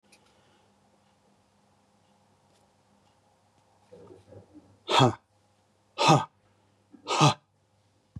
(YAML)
exhalation_length: 8.2 s
exhalation_amplitude: 17853
exhalation_signal_mean_std_ratio: 0.24
survey_phase: beta (2021-08-13 to 2022-03-07)
age: 45-64
gender: Male
wearing_mask: 'No'
symptom_none: true
smoker_status: Ex-smoker
respiratory_condition_asthma: false
respiratory_condition_other: false
recruitment_source: REACT
submission_delay: 2 days
covid_test_result: Negative
covid_test_method: RT-qPCR
influenza_a_test_result: Negative
influenza_b_test_result: Negative